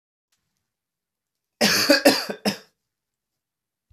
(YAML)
cough_length: 3.9 s
cough_amplitude: 26430
cough_signal_mean_std_ratio: 0.31
survey_phase: alpha (2021-03-01 to 2021-08-12)
age: 18-44
gender: Male
wearing_mask: 'No'
symptom_none: true
smoker_status: Never smoked
respiratory_condition_asthma: false
respiratory_condition_other: false
recruitment_source: REACT
submission_delay: 3 days
covid_test_result: Negative
covid_test_method: RT-qPCR